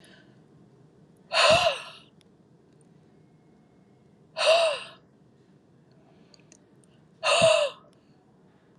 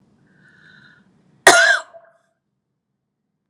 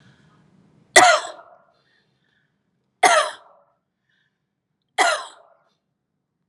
exhalation_length: 8.8 s
exhalation_amplitude: 13967
exhalation_signal_mean_std_ratio: 0.34
cough_length: 3.5 s
cough_amplitude: 32768
cough_signal_mean_std_ratio: 0.25
three_cough_length: 6.5 s
three_cough_amplitude: 32768
three_cough_signal_mean_std_ratio: 0.26
survey_phase: alpha (2021-03-01 to 2021-08-12)
age: 45-64
gender: Female
wearing_mask: 'Yes'
symptom_none: true
smoker_status: Ex-smoker
respiratory_condition_asthma: false
respiratory_condition_other: false
recruitment_source: Test and Trace
submission_delay: 0 days
covid_test_result: Negative
covid_test_method: LFT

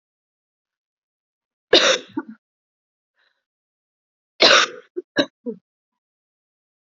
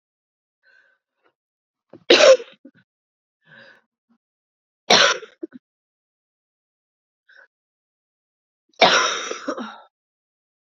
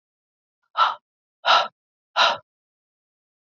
cough_length: 6.8 s
cough_amplitude: 31575
cough_signal_mean_std_ratio: 0.24
three_cough_length: 10.7 s
three_cough_amplitude: 32768
three_cough_signal_mean_std_ratio: 0.24
exhalation_length: 3.4 s
exhalation_amplitude: 19931
exhalation_signal_mean_std_ratio: 0.31
survey_phase: beta (2021-08-13 to 2022-03-07)
age: 18-44
gender: Female
wearing_mask: 'No'
symptom_cough_any: true
symptom_runny_or_blocked_nose: true
symptom_shortness_of_breath: true
symptom_sore_throat: true
symptom_fatigue: true
symptom_headache: true
symptom_change_to_sense_of_smell_or_taste: true
symptom_other: true
smoker_status: Never smoked
respiratory_condition_asthma: false
respiratory_condition_other: false
recruitment_source: Test and Trace
submission_delay: 1 day
covid_test_result: Positive
covid_test_method: LFT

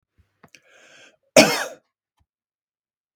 cough_length: 3.2 s
cough_amplitude: 32768
cough_signal_mean_std_ratio: 0.2
survey_phase: beta (2021-08-13 to 2022-03-07)
age: 45-64
gender: Male
wearing_mask: 'No'
symptom_none: true
smoker_status: Ex-smoker
respiratory_condition_asthma: false
respiratory_condition_other: false
recruitment_source: REACT
submission_delay: 0 days
covid_test_result: Negative
covid_test_method: RT-qPCR
influenza_a_test_result: Negative
influenza_b_test_result: Negative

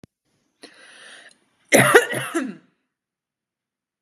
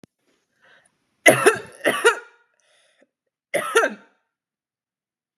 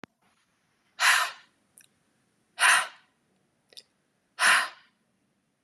cough_length: 4.0 s
cough_amplitude: 32767
cough_signal_mean_std_ratio: 0.28
three_cough_length: 5.4 s
three_cough_amplitude: 32767
three_cough_signal_mean_std_ratio: 0.29
exhalation_length: 5.6 s
exhalation_amplitude: 14662
exhalation_signal_mean_std_ratio: 0.31
survey_phase: beta (2021-08-13 to 2022-03-07)
age: 18-44
gender: Female
wearing_mask: 'No'
symptom_none: true
smoker_status: Never smoked
respiratory_condition_asthma: false
respiratory_condition_other: false
recruitment_source: REACT
submission_delay: 2 days
covid_test_result: Negative
covid_test_method: RT-qPCR
influenza_a_test_result: Unknown/Void
influenza_b_test_result: Unknown/Void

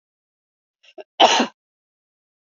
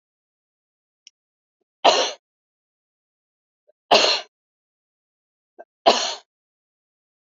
cough_length: 2.6 s
cough_amplitude: 30205
cough_signal_mean_std_ratio: 0.24
three_cough_length: 7.3 s
three_cough_amplitude: 30125
three_cough_signal_mean_std_ratio: 0.24
survey_phase: beta (2021-08-13 to 2022-03-07)
age: 45-64
gender: Female
wearing_mask: 'No'
symptom_none: true
smoker_status: Never smoked
respiratory_condition_asthma: false
respiratory_condition_other: false
recruitment_source: REACT
submission_delay: 1 day
covid_test_result: Negative
covid_test_method: RT-qPCR
influenza_a_test_result: Unknown/Void
influenza_b_test_result: Unknown/Void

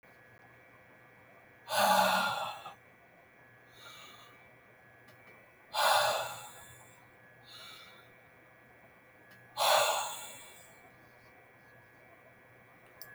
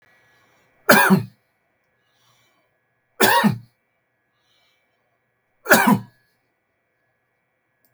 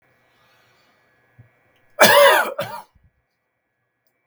exhalation_length: 13.1 s
exhalation_amplitude: 6920
exhalation_signal_mean_std_ratio: 0.38
three_cough_length: 7.9 s
three_cough_amplitude: 32768
three_cough_signal_mean_std_ratio: 0.28
cough_length: 4.3 s
cough_amplitude: 32768
cough_signal_mean_std_ratio: 0.29
survey_phase: beta (2021-08-13 to 2022-03-07)
age: 65+
gender: Male
wearing_mask: 'No'
symptom_none: true
smoker_status: Never smoked
respiratory_condition_asthma: false
respiratory_condition_other: false
recruitment_source: REACT
submission_delay: 1 day
covid_test_result: Negative
covid_test_method: RT-qPCR
influenza_a_test_result: Negative
influenza_b_test_result: Negative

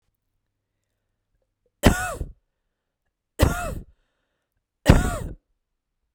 three_cough_length: 6.1 s
three_cough_amplitude: 32768
three_cough_signal_mean_std_ratio: 0.26
survey_phase: beta (2021-08-13 to 2022-03-07)
age: 45-64
gender: Female
wearing_mask: 'No'
symptom_none: true
smoker_status: Never smoked
respiratory_condition_asthma: false
respiratory_condition_other: false
recruitment_source: REACT
submission_delay: 2 days
covid_test_result: Negative
covid_test_method: RT-qPCR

